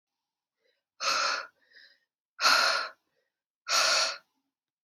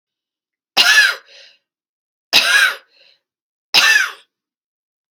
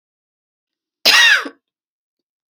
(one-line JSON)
{"exhalation_length": "4.8 s", "exhalation_amplitude": 10556, "exhalation_signal_mean_std_ratio": 0.43, "three_cough_length": "5.1 s", "three_cough_amplitude": 32768, "three_cough_signal_mean_std_ratio": 0.39, "cough_length": "2.5 s", "cough_amplitude": 31263, "cough_signal_mean_std_ratio": 0.32, "survey_phase": "alpha (2021-03-01 to 2021-08-12)", "age": "45-64", "gender": "Female", "wearing_mask": "No", "symptom_none": true, "symptom_onset": "6 days", "smoker_status": "Never smoked", "respiratory_condition_asthma": false, "respiratory_condition_other": true, "recruitment_source": "REACT", "submission_delay": "1 day", "covid_test_result": "Negative", "covid_test_method": "RT-qPCR"}